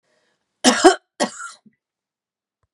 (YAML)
cough_length: 2.7 s
cough_amplitude: 32767
cough_signal_mean_std_ratio: 0.27
survey_phase: beta (2021-08-13 to 2022-03-07)
age: 45-64
gender: Female
wearing_mask: 'No'
symptom_none: true
smoker_status: Never smoked
respiratory_condition_asthma: false
respiratory_condition_other: false
recruitment_source: REACT
submission_delay: 1 day
covid_test_result: Negative
covid_test_method: RT-qPCR
influenza_a_test_result: Negative
influenza_b_test_result: Negative